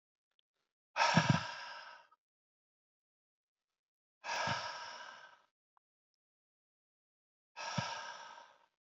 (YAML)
exhalation_length: 8.9 s
exhalation_amplitude: 6238
exhalation_signal_mean_std_ratio: 0.31
survey_phase: beta (2021-08-13 to 2022-03-07)
age: 18-44
gender: Male
wearing_mask: 'No'
symptom_cough_any: true
symptom_runny_or_blocked_nose: true
symptom_diarrhoea: true
symptom_onset: 4 days
smoker_status: Current smoker (e-cigarettes or vapes only)
respiratory_condition_asthma: false
respiratory_condition_other: false
recruitment_source: Test and Trace
submission_delay: 2 days
covid_test_result: Positive
covid_test_method: RT-qPCR
covid_ct_value: 13.2
covid_ct_gene: ORF1ab gene
covid_ct_mean: 13.5
covid_viral_load: 38000000 copies/ml
covid_viral_load_category: High viral load (>1M copies/ml)